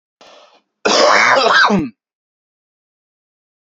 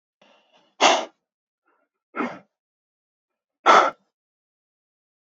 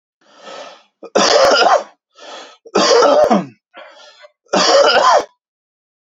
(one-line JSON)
{"cough_length": "3.7 s", "cough_amplitude": 31006, "cough_signal_mean_std_ratio": 0.46, "exhalation_length": "5.2 s", "exhalation_amplitude": 30549, "exhalation_signal_mean_std_ratio": 0.24, "three_cough_length": "6.1 s", "three_cough_amplitude": 32639, "three_cough_signal_mean_std_ratio": 0.54, "survey_phase": "beta (2021-08-13 to 2022-03-07)", "age": "18-44", "gender": "Male", "wearing_mask": "No", "symptom_cough_any": true, "symptom_onset": "11 days", "smoker_status": "Never smoked", "respiratory_condition_asthma": false, "respiratory_condition_other": false, "recruitment_source": "REACT", "submission_delay": "1 day", "covid_test_result": "Negative", "covid_test_method": "RT-qPCR"}